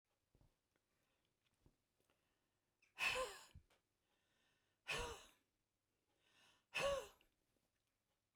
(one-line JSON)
{"exhalation_length": "8.4 s", "exhalation_amplitude": 1240, "exhalation_signal_mean_std_ratio": 0.28, "survey_phase": "beta (2021-08-13 to 2022-03-07)", "age": "65+", "gender": "Female", "wearing_mask": "No", "symptom_none": true, "smoker_status": "Ex-smoker", "respiratory_condition_asthma": true, "respiratory_condition_other": false, "recruitment_source": "REACT", "submission_delay": "1 day", "covid_test_result": "Negative", "covid_test_method": "RT-qPCR"}